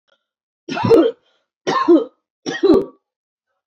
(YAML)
three_cough_length: 3.7 s
three_cough_amplitude: 26208
three_cough_signal_mean_std_ratio: 0.43
survey_phase: beta (2021-08-13 to 2022-03-07)
age: 18-44
gender: Female
wearing_mask: 'No'
symptom_cough_any: true
symptom_fatigue: true
symptom_headache: true
symptom_onset: 13 days
smoker_status: Ex-smoker
respiratory_condition_asthma: false
respiratory_condition_other: false
recruitment_source: REACT
submission_delay: 2 days
covid_test_result: Negative
covid_test_method: RT-qPCR